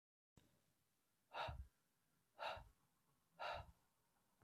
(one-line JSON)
{"exhalation_length": "4.4 s", "exhalation_amplitude": 567, "exhalation_signal_mean_std_ratio": 0.38, "survey_phase": "beta (2021-08-13 to 2022-03-07)", "age": "18-44", "gender": "Male", "wearing_mask": "No", "symptom_none": true, "smoker_status": "Never smoked", "respiratory_condition_asthma": false, "respiratory_condition_other": false, "recruitment_source": "REACT", "submission_delay": "1 day", "covid_test_result": "Negative", "covid_test_method": "RT-qPCR"}